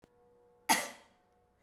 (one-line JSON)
{"cough_length": "1.6 s", "cough_amplitude": 7684, "cough_signal_mean_std_ratio": 0.26, "survey_phase": "beta (2021-08-13 to 2022-03-07)", "age": "45-64", "gender": "Female", "wearing_mask": "No", "symptom_none": true, "smoker_status": "Ex-smoker", "respiratory_condition_asthma": false, "respiratory_condition_other": false, "recruitment_source": "REACT", "submission_delay": "1 day", "covid_test_result": "Negative", "covid_test_method": "RT-qPCR"}